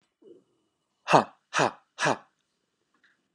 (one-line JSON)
{"exhalation_length": "3.3 s", "exhalation_amplitude": 25191, "exhalation_signal_mean_std_ratio": 0.26, "survey_phase": "beta (2021-08-13 to 2022-03-07)", "age": "18-44", "gender": "Male", "wearing_mask": "No", "symptom_none": true, "smoker_status": "Never smoked", "respiratory_condition_asthma": false, "respiratory_condition_other": false, "recruitment_source": "REACT", "submission_delay": "3 days", "covid_test_result": "Negative", "covid_test_method": "RT-qPCR", "influenza_a_test_result": "Negative", "influenza_b_test_result": "Negative"}